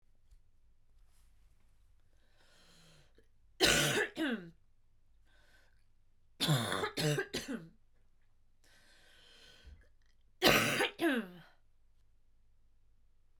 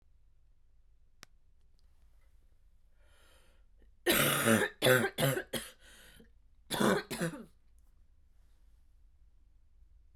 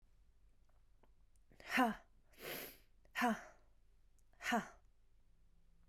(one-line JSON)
{"three_cough_length": "13.4 s", "three_cough_amplitude": 8157, "three_cough_signal_mean_std_ratio": 0.37, "cough_length": "10.2 s", "cough_amplitude": 10111, "cough_signal_mean_std_ratio": 0.35, "exhalation_length": "5.9 s", "exhalation_amplitude": 2616, "exhalation_signal_mean_std_ratio": 0.35, "survey_phase": "beta (2021-08-13 to 2022-03-07)", "age": "18-44", "gender": "Female", "wearing_mask": "No", "symptom_cough_any": true, "symptom_new_continuous_cough": true, "symptom_runny_or_blocked_nose": true, "symptom_sore_throat": true, "symptom_fatigue": true, "symptom_fever_high_temperature": true, "symptom_headache": true, "smoker_status": "Never smoked", "respiratory_condition_asthma": false, "respiratory_condition_other": false, "recruitment_source": "Test and Trace", "submission_delay": "2 days", "covid_test_result": "Positive", "covid_test_method": "RT-qPCR", "covid_ct_value": 22.8, "covid_ct_gene": "N gene"}